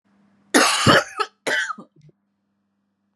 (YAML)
three_cough_length: 3.2 s
three_cough_amplitude: 32117
three_cough_signal_mean_std_ratio: 0.39
survey_phase: beta (2021-08-13 to 2022-03-07)
age: 18-44
gender: Female
wearing_mask: 'No'
symptom_runny_or_blocked_nose: true
symptom_sore_throat: true
symptom_fatigue: true
smoker_status: Ex-smoker
respiratory_condition_asthma: false
respiratory_condition_other: false
recruitment_source: Test and Trace
submission_delay: 1 day
covid_test_result: Negative
covid_test_method: RT-qPCR